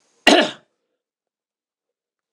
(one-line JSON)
{"cough_length": "2.3 s", "cough_amplitude": 26028, "cough_signal_mean_std_ratio": 0.23, "survey_phase": "beta (2021-08-13 to 2022-03-07)", "age": "65+", "gender": "Male", "wearing_mask": "No", "symptom_none": true, "smoker_status": "Never smoked", "respiratory_condition_asthma": false, "respiratory_condition_other": false, "recruitment_source": "REACT", "submission_delay": "1 day", "covid_test_result": "Negative", "covid_test_method": "RT-qPCR"}